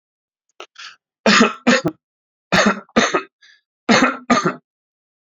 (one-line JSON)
{"three_cough_length": "5.4 s", "three_cough_amplitude": 32768, "three_cough_signal_mean_std_ratio": 0.41, "survey_phase": "alpha (2021-03-01 to 2021-08-12)", "age": "18-44", "gender": "Male", "wearing_mask": "No", "symptom_cough_any": true, "symptom_diarrhoea": true, "smoker_status": "Current smoker (e-cigarettes or vapes only)", "respiratory_condition_asthma": false, "respiratory_condition_other": false, "recruitment_source": "REACT", "submission_delay": "2 days", "covid_test_result": "Negative", "covid_test_method": "RT-qPCR"}